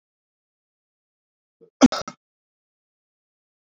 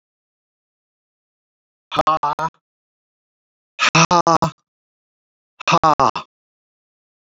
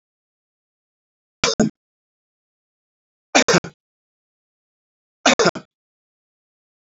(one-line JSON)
{"cough_length": "3.8 s", "cough_amplitude": 27865, "cough_signal_mean_std_ratio": 0.12, "exhalation_length": "7.3 s", "exhalation_amplitude": 31423, "exhalation_signal_mean_std_ratio": 0.3, "three_cough_length": "6.9 s", "three_cough_amplitude": 32768, "three_cough_signal_mean_std_ratio": 0.22, "survey_phase": "beta (2021-08-13 to 2022-03-07)", "age": "45-64", "gender": "Male", "wearing_mask": "No", "symptom_none": true, "smoker_status": "Never smoked", "respiratory_condition_asthma": false, "respiratory_condition_other": false, "recruitment_source": "REACT", "submission_delay": "1 day", "covid_test_result": "Negative", "covid_test_method": "RT-qPCR", "influenza_a_test_result": "Negative", "influenza_b_test_result": "Negative"}